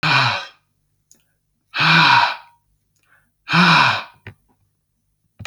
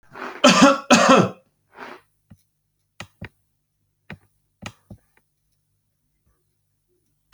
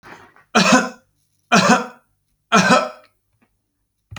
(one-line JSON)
{"exhalation_length": "5.5 s", "exhalation_amplitude": 28140, "exhalation_signal_mean_std_ratio": 0.44, "cough_length": "7.3 s", "cough_amplitude": 32768, "cough_signal_mean_std_ratio": 0.26, "three_cough_length": "4.2 s", "three_cough_amplitude": 32768, "three_cough_signal_mean_std_ratio": 0.4, "survey_phase": "alpha (2021-03-01 to 2021-08-12)", "age": "45-64", "gender": "Male", "wearing_mask": "No", "symptom_fatigue": true, "symptom_headache": true, "smoker_status": "Never smoked", "respiratory_condition_asthma": false, "respiratory_condition_other": false, "recruitment_source": "REACT", "submission_delay": "2 days", "covid_test_result": "Negative", "covid_test_method": "RT-qPCR"}